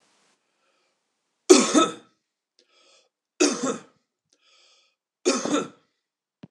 {"three_cough_length": "6.5 s", "three_cough_amplitude": 26028, "three_cough_signal_mean_std_ratio": 0.28, "survey_phase": "beta (2021-08-13 to 2022-03-07)", "age": "45-64", "gender": "Male", "wearing_mask": "No", "symptom_cough_any": true, "symptom_runny_or_blocked_nose": true, "symptom_change_to_sense_of_smell_or_taste": true, "symptom_loss_of_taste": true, "symptom_onset": "4 days", "smoker_status": "Ex-smoker", "respiratory_condition_asthma": false, "respiratory_condition_other": false, "recruitment_source": "Test and Trace", "submission_delay": "2 days", "covid_test_result": "Positive", "covid_test_method": "RT-qPCR"}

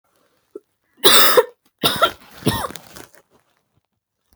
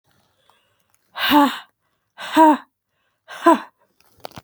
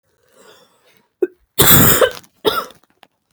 {"three_cough_length": "4.4 s", "three_cough_amplitude": 32768, "three_cough_signal_mean_std_ratio": 0.33, "exhalation_length": "4.4 s", "exhalation_amplitude": 28346, "exhalation_signal_mean_std_ratio": 0.33, "cough_length": "3.3 s", "cough_amplitude": 32768, "cough_signal_mean_std_ratio": 0.37, "survey_phase": "beta (2021-08-13 to 2022-03-07)", "age": "18-44", "gender": "Female", "wearing_mask": "No", "symptom_new_continuous_cough": true, "symptom_runny_or_blocked_nose": true, "symptom_fever_high_temperature": true, "symptom_headache": true, "smoker_status": "Never smoked", "respiratory_condition_asthma": false, "respiratory_condition_other": false, "recruitment_source": "Test and Trace", "submission_delay": "2 days", "covid_test_result": "Positive", "covid_test_method": "RT-qPCR", "covid_ct_value": 18.9, "covid_ct_gene": "ORF1ab gene", "covid_ct_mean": 19.1, "covid_viral_load": "530000 copies/ml", "covid_viral_load_category": "Low viral load (10K-1M copies/ml)"}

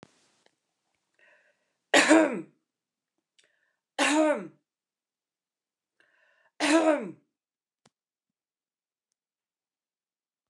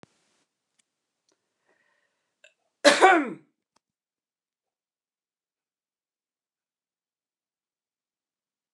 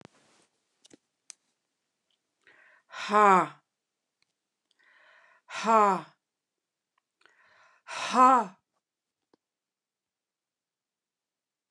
{"three_cough_length": "10.5 s", "three_cough_amplitude": 16034, "three_cough_signal_mean_std_ratio": 0.27, "cough_length": "8.7 s", "cough_amplitude": 27045, "cough_signal_mean_std_ratio": 0.16, "exhalation_length": "11.7 s", "exhalation_amplitude": 14412, "exhalation_signal_mean_std_ratio": 0.23, "survey_phase": "beta (2021-08-13 to 2022-03-07)", "age": "45-64", "gender": "Female", "wearing_mask": "No", "symptom_other": true, "symptom_onset": "9 days", "smoker_status": "Ex-smoker", "respiratory_condition_asthma": false, "respiratory_condition_other": false, "recruitment_source": "REACT", "submission_delay": "11 days", "covid_test_result": "Negative", "covid_test_method": "RT-qPCR"}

